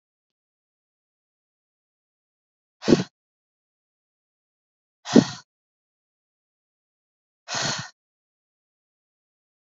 {"exhalation_length": "9.6 s", "exhalation_amplitude": 27572, "exhalation_signal_mean_std_ratio": 0.15, "survey_phase": "beta (2021-08-13 to 2022-03-07)", "age": "18-44", "gender": "Female", "wearing_mask": "No", "symptom_none": true, "smoker_status": "Never smoked", "respiratory_condition_asthma": false, "respiratory_condition_other": false, "recruitment_source": "REACT", "submission_delay": "0 days", "covid_test_result": "Negative", "covid_test_method": "RT-qPCR", "influenza_a_test_result": "Negative", "influenza_b_test_result": "Negative"}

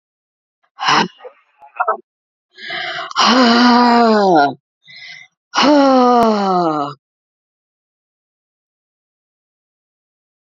{"exhalation_length": "10.5 s", "exhalation_amplitude": 32315, "exhalation_signal_mean_std_ratio": 0.48, "survey_phase": "beta (2021-08-13 to 2022-03-07)", "age": "65+", "gender": "Female", "wearing_mask": "No", "symptom_shortness_of_breath": true, "smoker_status": "Never smoked", "respiratory_condition_asthma": false, "respiratory_condition_other": false, "recruitment_source": "REACT", "submission_delay": "2 days", "covid_test_result": "Negative", "covid_test_method": "RT-qPCR", "influenza_a_test_result": "Negative", "influenza_b_test_result": "Negative"}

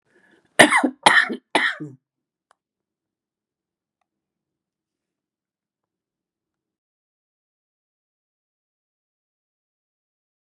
{"three_cough_length": "10.4 s", "three_cough_amplitude": 32768, "three_cough_signal_mean_std_ratio": 0.18, "survey_phase": "beta (2021-08-13 to 2022-03-07)", "age": "65+", "gender": "Female", "wearing_mask": "No", "symptom_none": true, "symptom_onset": "12 days", "smoker_status": "Ex-smoker", "respiratory_condition_asthma": true, "respiratory_condition_other": true, "recruitment_source": "REACT", "submission_delay": "1 day", "covid_test_result": "Negative", "covid_test_method": "RT-qPCR", "influenza_a_test_result": "Unknown/Void", "influenza_b_test_result": "Unknown/Void"}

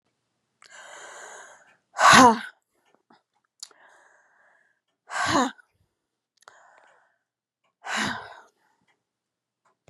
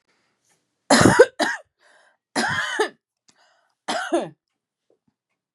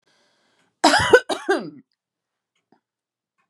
{"exhalation_length": "9.9 s", "exhalation_amplitude": 28457, "exhalation_signal_mean_std_ratio": 0.23, "three_cough_length": "5.5 s", "three_cough_amplitude": 32273, "three_cough_signal_mean_std_ratio": 0.33, "cough_length": "3.5 s", "cough_amplitude": 32714, "cough_signal_mean_std_ratio": 0.29, "survey_phase": "beta (2021-08-13 to 2022-03-07)", "age": "45-64", "gender": "Female", "wearing_mask": "No", "symptom_none": true, "symptom_onset": "12 days", "smoker_status": "Ex-smoker", "respiratory_condition_asthma": false, "respiratory_condition_other": true, "recruitment_source": "REACT", "submission_delay": "2 days", "covid_test_result": "Negative", "covid_test_method": "RT-qPCR", "influenza_a_test_result": "Negative", "influenza_b_test_result": "Negative"}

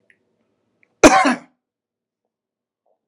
{"cough_length": "3.1 s", "cough_amplitude": 32768, "cough_signal_mean_std_ratio": 0.23, "survey_phase": "beta (2021-08-13 to 2022-03-07)", "age": "65+", "gender": "Male", "wearing_mask": "No", "symptom_none": true, "smoker_status": "Never smoked", "respiratory_condition_asthma": false, "respiratory_condition_other": false, "recruitment_source": "REACT", "submission_delay": "1 day", "covid_test_result": "Negative", "covid_test_method": "RT-qPCR"}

